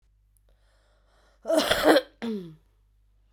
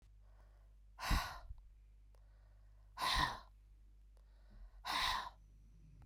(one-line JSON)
{"cough_length": "3.3 s", "cough_amplitude": 21124, "cough_signal_mean_std_ratio": 0.35, "exhalation_length": "6.1 s", "exhalation_amplitude": 2376, "exhalation_signal_mean_std_ratio": 0.46, "survey_phase": "beta (2021-08-13 to 2022-03-07)", "age": "45-64", "gender": "Female", "wearing_mask": "No", "symptom_cough_any": true, "symptom_runny_or_blocked_nose": true, "symptom_sore_throat": true, "symptom_fatigue": true, "symptom_onset": "12 days", "smoker_status": "Current smoker (1 to 10 cigarettes per day)", "respiratory_condition_asthma": false, "respiratory_condition_other": false, "recruitment_source": "REACT", "submission_delay": "3 days", "covid_test_result": "Negative", "covid_test_method": "RT-qPCR", "influenza_a_test_result": "Negative", "influenza_b_test_result": "Negative"}